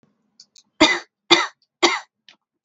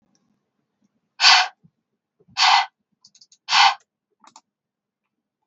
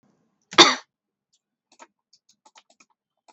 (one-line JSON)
{"three_cough_length": "2.6 s", "three_cough_amplitude": 32768, "three_cough_signal_mean_std_ratio": 0.31, "exhalation_length": "5.5 s", "exhalation_amplitude": 32768, "exhalation_signal_mean_std_ratio": 0.29, "cough_length": "3.3 s", "cough_amplitude": 32768, "cough_signal_mean_std_ratio": 0.16, "survey_phase": "beta (2021-08-13 to 2022-03-07)", "age": "18-44", "gender": "Female", "wearing_mask": "No", "symptom_none": true, "smoker_status": "Never smoked", "respiratory_condition_asthma": false, "respiratory_condition_other": false, "recruitment_source": "REACT", "submission_delay": "3 days", "covid_test_result": "Negative", "covid_test_method": "RT-qPCR", "influenza_a_test_result": "Negative", "influenza_b_test_result": "Negative"}